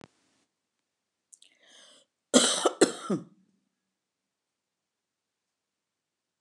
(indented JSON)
{
  "cough_length": "6.4 s",
  "cough_amplitude": 21505,
  "cough_signal_mean_std_ratio": 0.21,
  "survey_phase": "beta (2021-08-13 to 2022-03-07)",
  "age": "65+",
  "gender": "Female",
  "wearing_mask": "No",
  "symptom_none": true,
  "smoker_status": "Never smoked",
  "respiratory_condition_asthma": false,
  "respiratory_condition_other": false,
  "recruitment_source": "REACT",
  "submission_delay": "13 days",
  "covid_test_result": "Negative",
  "covid_test_method": "RT-qPCR"
}